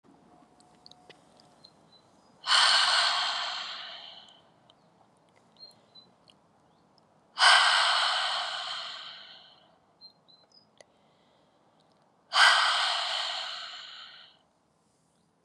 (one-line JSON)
{"exhalation_length": "15.4 s", "exhalation_amplitude": 14700, "exhalation_signal_mean_std_ratio": 0.4, "survey_phase": "beta (2021-08-13 to 2022-03-07)", "age": "45-64", "gender": "Female", "wearing_mask": "No", "symptom_cough_any": true, "symptom_runny_or_blocked_nose": true, "symptom_abdominal_pain": true, "symptom_fatigue": true, "symptom_headache": true, "symptom_change_to_sense_of_smell_or_taste": true, "symptom_loss_of_taste": true, "symptom_onset": "5 days", "smoker_status": "Never smoked", "respiratory_condition_asthma": false, "respiratory_condition_other": false, "recruitment_source": "Test and Trace", "submission_delay": "3 days", "covid_test_result": "Positive", "covid_test_method": "RT-qPCR", "covid_ct_value": 16.6, "covid_ct_gene": "ORF1ab gene", "covid_ct_mean": 17.1, "covid_viral_load": "2400000 copies/ml", "covid_viral_load_category": "High viral load (>1M copies/ml)"}